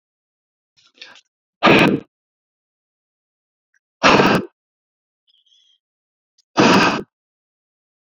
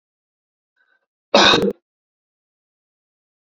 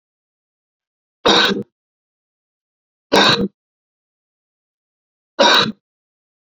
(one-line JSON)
{"exhalation_length": "8.2 s", "exhalation_amplitude": 28923, "exhalation_signal_mean_std_ratio": 0.3, "cough_length": "3.4 s", "cough_amplitude": 31347, "cough_signal_mean_std_ratio": 0.25, "three_cough_length": "6.6 s", "three_cough_amplitude": 29630, "three_cough_signal_mean_std_ratio": 0.31, "survey_phase": "beta (2021-08-13 to 2022-03-07)", "age": "45-64", "gender": "Male", "wearing_mask": "No", "symptom_none": true, "smoker_status": "Ex-smoker", "respiratory_condition_asthma": false, "respiratory_condition_other": false, "recruitment_source": "REACT", "submission_delay": "1 day", "covid_test_result": "Negative", "covid_test_method": "RT-qPCR"}